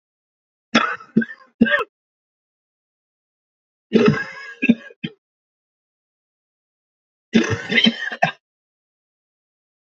{"three_cough_length": "9.9 s", "three_cough_amplitude": 27760, "three_cough_signal_mean_std_ratio": 0.31, "survey_phase": "beta (2021-08-13 to 2022-03-07)", "age": "45-64", "gender": "Male", "wearing_mask": "No", "symptom_cough_any": true, "symptom_runny_or_blocked_nose": true, "symptom_shortness_of_breath": true, "symptom_sore_throat": true, "symptom_abdominal_pain": true, "symptom_diarrhoea": true, "symptom_fatigue": true, "symptom_change_to_sense_of_smell_or_taste": true, "symptom_onset": "12 days", "smoker_status": "Never smoked", "respiratory_condition_asthma": true, "respiratory_condition_other": false, "recruitment_source": "REACT", "submission_delay": "3 days", "covid_test_result": "Negative", "covid_test_method": "RT-qPCR"}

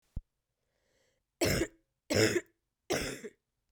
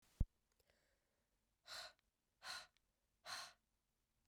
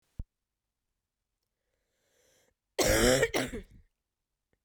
{"three_cough_length": "3.7 s", "three_cough_amplitude": 7734, "three_cough_signal_mean_std_ratio": 0.38, "exhalation_length": "4.3 s", "exhalation_amplitude": 1985, "exhalation_signal_mean_std_ratio": 0.22, "cough_length": "4.6 s", "cough_amplitude": 9573, "cough_signal_mean_std_ratio": 0.31, "survey_phase": "beta (2021-08-13 to 2022-03-07)", "age": "18-44", "gender": "Female", "wearing_mask": "No", "symptom_cough_any": true, "symptom_runny_or_blocked_nose": true, "symptom_change_to_sense_of_smell_or_taste": true, "symptom_onset": "3 days", "smoker_status": "Never smoked", "respiratory_condition_asthma": false, "respiratory_condition_other": false, "recruitment_source": "Test and Trace", "submission_delay": "2 days", "covid_test_result": "Positive", "covid_test_method": "RT-qPCR", "covid_ct_value": 23.7, "covid_ct_gene": "N gene"}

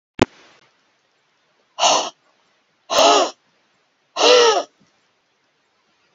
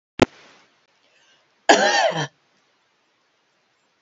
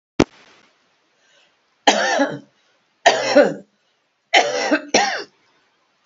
{"exhalation_length": "6.1 s", "exhalation_amplitude": 30162, "exhalation_signal_mean_std_ratio": 0.35, "cough_length": "4.0 s", "cough_amplitude": 30115, "cough_signal_mean_std_ratio": 0.28, "three_cough_length": "6.1 s", "three_cough_amplitude": 31548, "three_cough_signal_mean_std_ratio": 0.39, "survey_phase": "beta (2021-08-13 to 2022-03-07)", "age": "65+", "gender": "Female", "wearing_mask": "No", "symptom_runny_or_blocked_nose": true, "smoker_status": "Ex-smoker", "respiratory_condition_asthma": false, "respiratory_condition_other": false, "recruitment_source": "REACT", "submission_delay": "1 day", "covid_test_result": "Negative", "covid_test_method": "RT-qPCR", "influenza_a_test_result": "Negative", "influenza_b_test_result": "Negative"}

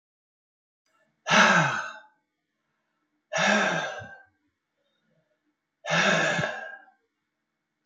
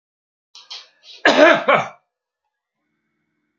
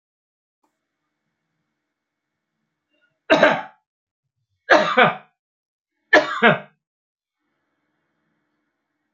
{"exhalation_length": "7.9 s", "exhalation_amplitude": 19519, "exhalation_signal_mean_std_ratio": 0.4, "cough_length": "3.6 s", "cough_amplitude": 29607, "cough_signal_mean_std_ratio": 0.31, "three_cough_length": "9.1 s", "three_cough_amplitude": 28932, "three_cough_signal_mean_std_ratio": 0.25, "survey_phase": "beta (2021-08-13 to 2022-03-07)", "age": "65+", "gender": "Male", "wearing_mask": "No", "symptom_none": true, "smoker_status": "Never smoked", "respiratory_condition_asthma": false, "respiratory_condition_other": false, "recruitment_source": "REACT", "submission_delay": "2 days", "covid_test_result": "Negative", "covid_test_method": "RT-qPCR"}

